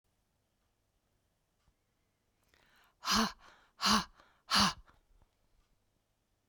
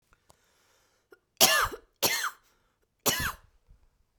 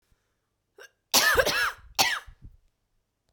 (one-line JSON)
{"exhalation_length": "6.5 s", "exhalation_amplitude": 6158, "exhalation_signal_mean_std_ratio": 0.27, "three_cough_length": "4.2 s", "three_cough_amplitude": 25490, "three_cough_signal_mean_std_ratio": 0.33, "cough_length": "3.3 s", "cough_amplitude": 18483, "cough_signal_mean_std_ratio": 0.39, "survey_phase": "beta (2021-08-13 to 2022-03-07)", "age": "45-64", "gender": "Female", "wearing_mask": "No", "symptom_cough_any": true, "symptom_runny_or_blocked_nose": true, "symptom_diarrhoea": true, "symptom_fatigue": true, "symptom_headache": true, "symptom_change_to_sense_of_smell_or_taste": true, "symptom_loss_of_taste": true, "smoker_status": "Never smoked", "respiratory_condition_asthma": false, "respiratory_condition_other": false, "recruitment_source": "Test and Trace", "submission_delay": "2 days", "covid_test_result": "Positive", "covid_test_method": "ePCR"}